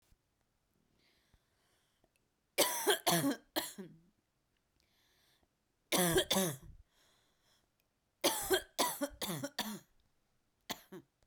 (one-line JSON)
{"three_cough_length": "11.3 s", "three_cough_amplitude": 5925, "three_cough_signal_mean_std_ratio": 0.36, "survey_phase": "beta (2021-08-13 to 2022-03-07)", "age": "18-44", "gender": "Female", "wearing_mask": "No", "symptom_cough_any": true, "smoker_status": "Never smoked", "respiratory_condition_asthma": true, "respiratory_condition_other": false, "recruitment_source": "Test and Trace", "submission_delay": "1 day", "covid_test_result": "Positive", "covid_test_method": "RT-qPCR"}